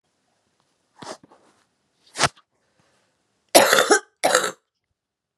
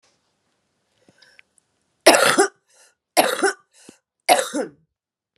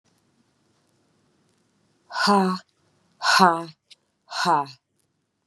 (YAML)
cough_length: 5.4 s
cough_amplitude: 32768
cough_signal_mean_std_ratio: 0.28
three_cough_length: 5.4 s
three_cough_amplitude: 32768
three_cough_signal_mean_std_ratio: 0.32
exhalation_length: 5.5 s
exhalation_amplitude: 30077
exhalation_signal_mean_std_ratio: 0.34
survey_phase: beta (2021-08-13 to 2022-03-07)
age: 45-64
gender: Female
wearing_mask: 'No'
symptom_cough_any: true
symptom_runny_or_blocked_nose: true
symptom_sore_throat: true
symptom_change_to_sense_of_smell_or_taste: true
symptom_loss_of_taste: true
symptom_other: true
symptom_onset: 2 days
smoker_status: Current smoker (1 to 10 cigarettes per day)
respiratory_condition_asthma: false
respiratory_condition_other: false
recruitment_source: Test and Trace
submission_delay: 1 day
covid_test_result: Positive
covid_test_method: RT-qPCR